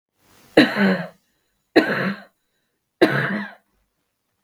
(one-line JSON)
{"three_cough_length": "4.4 s", "three_cough_amplitude": 32768, "three_cough_signal_mean_std_ratio": 0.38, "survey_phase": "beta (2021-08-13 to 2022-03-07)", "age": "65+", "gender": "Female", "wearing_mask": "No", "symptom_cough_any": true, "symptom_runny_or_blocked_nose": true, "symptom_sore_throat": true, "symptom_change_to_sense_of_smell_or_taste": true, "symptom_other": true, "smoker_status": "Ex-smoker", "respiratory_condition_asthma": false, "respiratory_condition_other": false, "recruitment_source": "Test and Trace", "submission_delay": "0 days", "covid_test_result": "Positive", "covid_test_method": "LFT"}